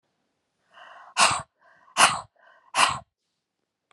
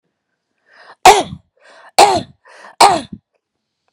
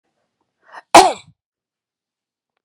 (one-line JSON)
{"exhalation_length": "3.9 s", "exhalation_amplitude": 25442, "exhalation_signal_mean_std_ratio": 0.31, "three_cough_length": "3.9 s", "three_cough_amplitude": 32768, "three_cough_signal_mean_std_ratio": 0.31, "cough_length": "2.6 s", "cough_amplitude": 32768, "cough_signal_mean_std_ratio": 0.2, "survey_phase": "beta (2021-08-13 to 2022-03-07)", "age": "45-64", "gender": "Female", "wearing_mask": "No", "symptom_none": true, "smoker_status": "Never smoked", "respiratory_condition_asthma": false, "respiratory_condition_other": false, "recruitment_source": "REACT", "submission_delay": "2 days", "covid_test_result": "Negative", "covid_test_method": "RT-qPCR"}